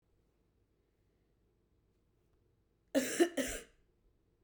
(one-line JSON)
{"cough_length": "4.4 s", "cough_amplitude": 4972, "cough_signal_mean_std_ratio": 0.25, "survey_phase": "beta (2021-08-13 to 2022-03-07)", "age": "18-44", "gender": "Female", "wearing_mask": "No", "symptom_cough_any": true, "symptom_runny_or_blocked_nose": true, "symptom_sore_throat": true, "symptom_headache": true, "smoker_status": "Never smoked", "respiratory_condition_asthma": false, "respiratory_condition_other": false, "recruitment_source": "Test and Trace", "submission_delay": "2 days", "covid_test_result": "Positive", "covid_test_method": "RT-qPCR", "covid_ct_value": 35.7, "covid_ct_gene": "ORF1ab gene"}